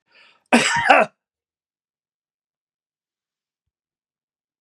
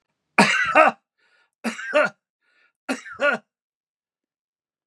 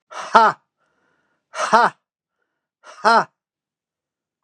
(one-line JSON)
{"cough_length": "4.6 s", "cough_amplitude": 32768, "cough_signal_mean_std_ratio": 0.25, "three_cough_length": "4.9 s", "three_cough_amplitude": 30536, "three_cough_signal_mean_std_ratio": 0.34, "exhalation_length": "4.4 s", "exhalation_amplitude": 32768, "exhalation_signal_mean_std_ratio": 0.29, "survey_phase": "beta (2021-08-13 to 2022-03-07)", "age": "65+", "gender": "Male", "wearing_mask": "No", "symptom_none": true, "smoker_status": "Never smoked", "respiratory_condition_asthma": false, "respiratory_condition_other": false, "recruitment_source": "REACT", "submission_delay": "2 days", "covid_test_result": "Negative", "covid_test_method": "RT-qPCR", "influenza_a_test_result": "Negative", "influenza_b_test_result": "Negative"}